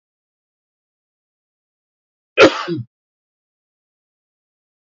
{"cough_length": "4.9 s", "cough_amplitude": 28610, "cough_signal_mean_std_ratio": 0.17, "survey_phase": "beta (2021-08-13 to 2022-03-07)", "age": "45-64", "gender": "Male", "wearing_mask": "No", "symptom_none": true, "smoker_status": "Never smoked", "respiratory_condition_asthma": true, "respiratory_condition_other": false, "recruitment_source": "REACT", "submission_delay": "1 day", "covid_test_result": "Negative", "covid_test_method": "RT-qPCR", "influenza_a_test_result": "Unknown/Void", "influenza_b_test_result": "Unknown/Void"}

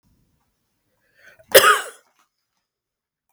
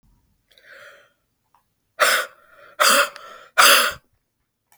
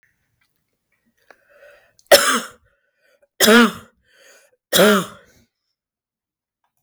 {"cough_length": "3.3 s", "cough_amplitude": 32768, "cough_signal_mean_std_ratio": 0.21, "exhalation_length": "4.8 s", "exhalation_amplitude": 32768, "exhalation_signal_mean_std_ratio": 0.35, "three_cough_length": "6.8 s", "three_cough_amplitude": 32768, "three_cough_signal_mean_std_ratio": 0.29, "survey_phase": "beta (2021-08-13 to 2022-03-07)", "age": "45-64", "gender": "Female", "wearing_mask": "No", "symptom_none": true, "symptom_onset": "10 days", "smoker_status": "Ex-smoker", "respiratory_condition_asthma": true, "respiratory_condition_other": false, "recruitment_source": "REACT", "submission_delay": "2 days", "covid_test_result": "Negative", "covid_test_method": "RT-qPCR", "covid_ct_value": 39.0, "covid_ct_gene": "E gene"}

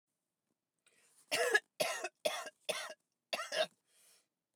{"cough_length": "4.6 s", "cough_amplitude": 4587, "cough_signal_mean_std_ratio": 0.38, "survey_phase": "beta (2021-08-13 to 2022-03-07)", "age": "45-64", "gender": "Female", "wearing_mask": "No", "symptom_other": true, "smoker_status": "Never smoked", "respiratory_condition_asthma": false, "respiratory_condition_other": false, "recruitment_source": "REACT", "submission_delay": "3 days", "covid_test_result": "Negative", "covid_test_method": "RT-qPCR", "influenza_a_test_result": "Negative", "influenza_b_test_result": "Negative"}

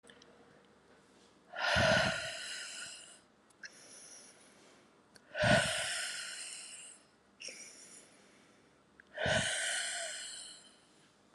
{"exhalation_length": "11.3 s", "exhalation_amplitude": 5735, "exhalation_signal_mean_std_ratio": 0.46, "survey_phase": "alpha (2021-03-01 to 2021-08-12)", "age": "18-44", "gender": "Female", "wearing_mask": "No", "symptom_fatigue": true, "symptom_fever_high_temperature": true, "symptom_headache": true, "symptom_onset": "4 days", "smoker_status": "Never smoked", "respiratory_condition_asthma": false, "respiratory_condition_other": false, "recruitment_source": "Test and Trace", "submission_delay": "1 day", "covid_test_result": "Positive", "covid_test_method": "RT-qPCR", "covid_ct_value": 34.9, "covid_ct_gene": "ORF1ab gene"}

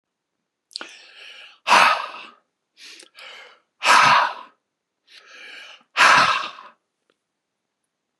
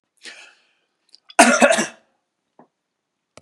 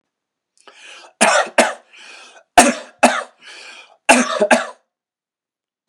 {"exhalation_length": "8.2 s", "exhalation_amplitude": 27838, "exhalation_signal_mean_std_ratio": 0.34, "cough_length": "3.4 s", "cough_amplitude": 32768, "cough_signal_mean_std_ratio": 0.28, "three_cough_length": "5.9 s", "three_cough_amplitude": 32768, "three_cough_signal_mean_std_ratio": 0.36, "survey_phase": "beta (2021-08-13 to 2022-03-07)", "age": "45-64", "gender": "Male", "wearing_mask": "No", "symptom_none": true, "smoker_status": "Never smoked", "respiratory_condition_asthma": false, "respiratory_condition_other": false, "recruitment_source": "REACT", "submission_delay": "6 days", "covid_test_result": "Negative", "covid_test_method": "RT-qPCR"}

